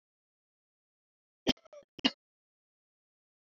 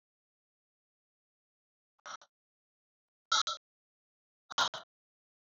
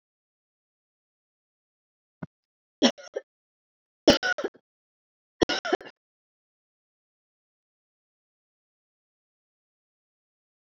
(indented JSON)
{
  "cough_length": "3.6 s",
  "cough_amplitude": 9192,
  "cough_signal_mean_std_ratio": 0.13,
  "exhalation_length": "5.5 s",
  "exhalation_amplitude": 4885,
  "exhalation_signal_mean_std_ratio": 0.19,
  "three_cough_length": "10.8 s",
  "three_cough_amplitude": 23692,
  "three_cough_signal_mean_std_ratio": 0.16,
  "survey_phase": "alpha (2021-03-01 to 2021-08-12)",
  "age": "45-64",
  "gender": "Female",
  "wearing_mask": "No",
  "symptom_fatigue": true,
  "symptom_fever_high_temperature": true,
  "symptom_headache": true,
  "symptom_change_to_sense_of_smell_or_taste": true,
  "symptom_onset": "2 days",
  "smoker_status": "Never smoked",
  "respiratory_condition_asthma": true,
  "respiratory_condition_other": false,
  "recruitment_source": "Test and Trace",
  "submission_delay": "2 days",
  "covid_test_result": "Positive",
  "covid_test_method": "RT-qPCR",
  "covid_ct_value": 24.4,
  "covid_ct_gene": "ORF1ab gene",
  "covid_ct_mean": 25.0,
  "covid_viral_load": "6400 copies/ml",
  "covid_viral_load_category": "Minimal viral load (< 10K copies/ml)"
}